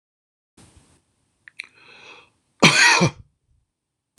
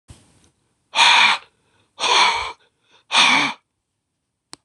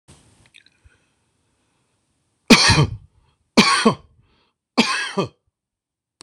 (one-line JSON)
{"cough_length": "4.2 s", "cough_amplitude": 26028, "cough_signal_mean_std_ratio": 0.28, "exhalation_length": "4.6 s", "exhalation_amplitude": 25613, "exhalation_signal_mean_std_ratio": 0.43, "three_cough_length": "6.2 s", "three_cough_amplitude": 26028, "three_cough_signal_mean_std_ratio": 0.31, "survey_phase": "beta (2021-08-13 to 2022-03-07)", "age": "65+", "gender": "Male", "wearing_mask": "No", "symptom_cough_any": true, "symptom_fatigue": true, "symptom_onset": "12 days", "smoker_status": "Ex-smoker", "respiratory_condition_asthma": true, "respiratory_condition_other": false, "recruitment_source": "REACT", "submission_delay": "1 day", "covid_test_result": "Negative", "covid_test_method": "RT-qPCR", "influenza_a_test_result": "Unknown/Void", "influenza_b_test_result": "Unknown/Void"}